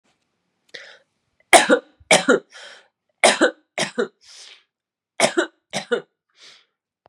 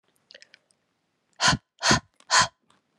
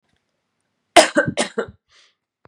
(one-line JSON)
{"three_cough_length": "7.1 s", "three_cough_amplitude": 32768, "three_cough_signal_mean_std_ratio": 0.31, "exhalation_length": "3.0 s", "exhalation_amplitude": 18275, "exhalation_signal_mean_std_ratio": 0.32, "cough_length": "2.5 s", "cough_amplitude": 32768, "cough_signal_mean_std_ratio": 0.27, "survey_phase": "beta (2021-08-13 to 2022-03-07)", "age": "18-44", "gender": "Female", "wearing_mask": "No", "symptom_cough_any": true, "symptom_runny_or_blocked_nose": true, "symptom_change_to_sense_of_smell_or_taste": true, "symptom_loss_of_taste": true, "symptom_other": true, "smoker_status": "Never smoked", "respiratory_condition_asthma": false, "respiratory_condition_other": false, "recruitment_source": "Test and Trace", "submission_delay": "1 day", "covid_test_result": "Positive", "covid_test_method": "ePCR"}